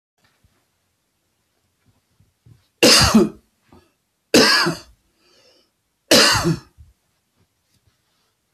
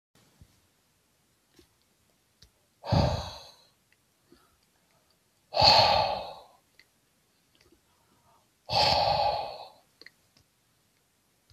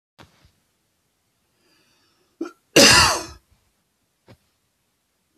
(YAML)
three_cough_length: 8.5 s
three_cough_amplitude: 31158
three_cough_signal_mean_std_ratio: 0.32
exhalation_length: 11.5 s
exhalation_amplitude: 17009
exhalation_signal_mean_std_ratio: 0.32
cough_length: 5.4 s
cough_amplitude: 32767
cough_signal_mean_std_ratio: 0.24
survey_phase: beta (2021-08-13 to 2022-03-07)
age: 65+
gender: Male
wearing_mask: 'No'
symptom_runny_or_blocked_nose: true
smoker_status: Ex-smoker
respiratory_condition_asthma: false
respiratory_condition_other: false
recruitment_source: REACT
submission_delay: 1 day
covid_test_result: Negative
covid_test_method: RT-qPCR